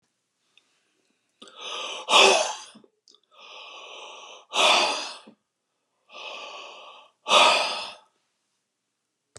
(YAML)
exhalation_length: 9.4 s
exhalation_amplitude: 24935
exhalation_signal_mean_std_ratio: 0.35
survey_phase: beta (2021-08-13 to 2022-03-07)
age: 65+
gender: Male
wearing_mask: 'No'
symptom_none: true
smoker_status: Ex-smoker
respiratory_condition_asthma: false
respiratory_condition_other: false
recruitment_source: REACT
submission_delay: 2 days
covid_test_result: Negative
covid_test_method: RT-qPCR